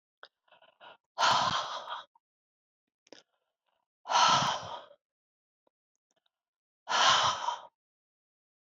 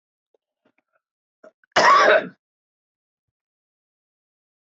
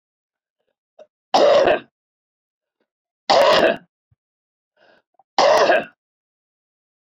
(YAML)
exhalation_length: 8.8 s
exhalation_amplitude: 9294
exhalation_signal_mean_std_ratio: 0.36
cough_length: 4.6 s
cough_amplitude: 25288
cough_signal_mean_std_ratio: 0.27
three_cough_length: 7.2 s
three_cough_amplitude: 25153
three_cough_signal_mean_std_ratio: 0.37
survey_phase: alpha (2021-03-01 to 2021-08-12)
age: 65+
gender: Female
wearing_mask: 'No'
symptom_cough_any: true
symptom_shortness_of_breath: true
symptom_onset: 6 days
smoker_status: Ex-smoker
respiratory_condition_asthma: false
respiratory_condition_other: true
recruitment_source: REACT
submission_delay: 1 day
covid_test_result: Negative
covid_test_method: RT-qPCR